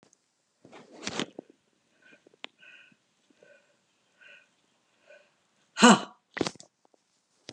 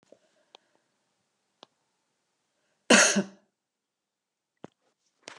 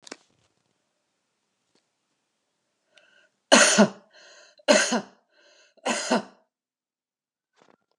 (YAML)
exhalation_length: 7.5 s
exhalation_amplitude: 21856
exhalation_signal_mean_std_ratio: 0.17
cough_length: 5.4 s
cough_amplitude: 19464
cough_signal_mean_std_ratio: 0.19
three_cough_length: 8.0 s
three_cough_amplitude: 29890
three_cough_signal_mean_std_ratio: 0.26
survey_phase: beta (2021-08-13 to 2022-03-07)
age: 65+
gender: Female
wearing_mask: 'No'
symptom_none: true
smoker_status: Ex-smoker
respiratory_condition_asthma: false
respiratory_condition_other: false
recruitment_source: REACT
submission_delay: 1 day
covid_test_result: Negative
covid_test_method: RT-qPCR